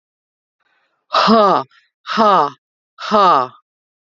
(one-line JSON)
{"exhalation_length": "4.0 s", "exhalation_amplitude": 31015, "exhalation_signal_mean_std_ratio": 0.46, "survey_phase": "beta (2021-08-13 to 2022-03-07)", "age": "45-64", "gender": "Female", "wearing_mask": "No", "symptom_cough_any": true, "symptom_runny_or_blocked_nose": true, "symptom_abdominal_pain": true, "symptom_onset": "12 days", "smoker_status": "Ex-smoker", "respiratory_condition_asthma": false, "respiratory_condition_other": false, "recruitment_source": "REACT", "submission_delay": "1 day", "covid_test_result": "Positive", "covid_test_method": "RT-qPCR", "covid_ct_value": 32.2, "covid_ct_gene": "E gene", "influenza_a_test_result": "Negative", "influenza_b_test_result": "Negative"}